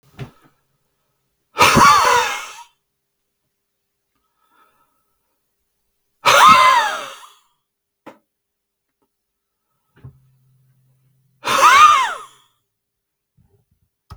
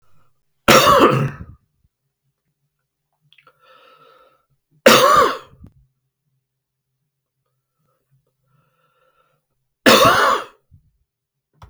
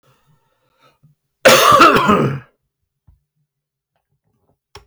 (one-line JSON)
{"exhalation_length": "14.2 s", "exhalation_amplitude": 32768, "exhalation_signal_mean_std_ratio": 0.32, "three_cough_length": "11.7 s", "three_cough_amplitude": 32768, "three_cough_signal_mean_std_ratio": 0.3, "cough_length": "4.9 s", "cough_amplitude": 32768, "cough_signal_mean_std_ratio": 0.35, "survey_phase": "beta (2021-08-13 to 2022-03-07)", "age": "65+", "gender": "Male", "wearing_mask": "No", "symptom_none": true, "smoker_status": "Ex-smoker", "respiratory_condition_asthma": false, "respiratory_condition_other": false, "recruitment_source": "REACT", "submission_delay": "2 days", "covid_test_result": "Negative", "covid_test_method": "RT-qPCR", "influenza_a_test_result": "Negative", "influenza_b_test_result": "Negative"}